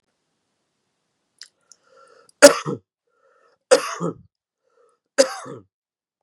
{
  "three_cough_length": "6.2 s",
  "three_cough_amplitude": 32768,
  "three_cough_signal_mean_std_ratio": 0.19,
  "survey_phase": "beta (2021-08-13 to 2022-03-07)",
  "age": "45-64",
  "gender": "Male",
  "wearing_mask": "No",
  "symptom_cough_any": true,
  "symptom_runny_or_blocked_nose": true,
  "symptom_onset": "2 days",
  "smoker_status": "Ex-smoker",
  "respiratory_condition_asthma": false,
  "respiratory_condition_other": false,
  "recruitment_source": "Test and Trace",
  "submission_delay": "2 days",
  "covid_test_result": "Positive",
  "covid_test_method": "RT-qPCR"
}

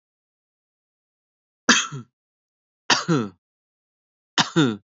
{
  "cough_length": "4.9 s",
  "cough_amplitude": 31196,
  "cough_signal_mean_std_ratio": 0.3,
  "survey_phase": "beta (2021-08-13 to 2022-03-07)",
  "age": "18-44",
  "gender": "Male",
  "wearing_mask": "No",
  "symptom_none": true,
  "smoker_status": "Never smoked",
  "respiratory_condition_asthma": false,
  "respiratory_condition_other": false,
  "recruitment_source": "REACT",
  "submission_delay": "1 day",
  "covid_test_result": "Negative",
  "covid_test_method": "RT-qPCR",
  "influenza_a_test_result": "Negative",
  "influenza_b_test_result": "Negative"
}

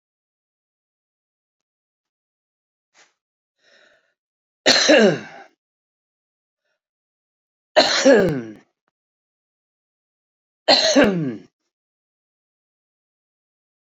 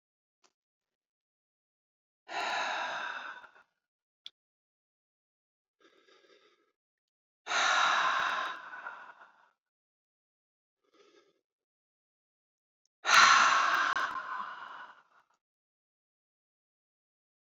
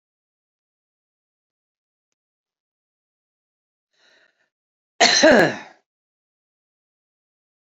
{
  "three_cough_length": "14.0 s",
  "three_cough_amplitude": 31870,
  "three_cough_signal_mean_std_ratio": 0.27,
  "exhalation_length": "17.6 s",
  "exhalation_amplitude": 12134,
  "exhalation_signal_mean_std_ratio": 0.32,
  "cough_length": "7.8 s",
  "cough_amplitude": 30236,
  "cough_signal_mean_std_ratio": 0.2,
  "survey_phase": "beta (2021-08-13 to 2022-03-07)",
  "age": "65+",
  "gender": "Female",
  "wearing_mask": "No",
  "symptom_none": true,
  "smoker_status": "Ex-smoker",
  "respiratory_condition_asthma": false,
  "respiratory_condition_other": false,
  "recruitment_source": "REACT",
  "submission_delay": "11 days",
  "covid_test_result": "Negative",
  "covid_test_method": "RT-qPCR",
  "influenza_a_test_result": "Negative",
  "influenza_b_test_result": "Negative"
}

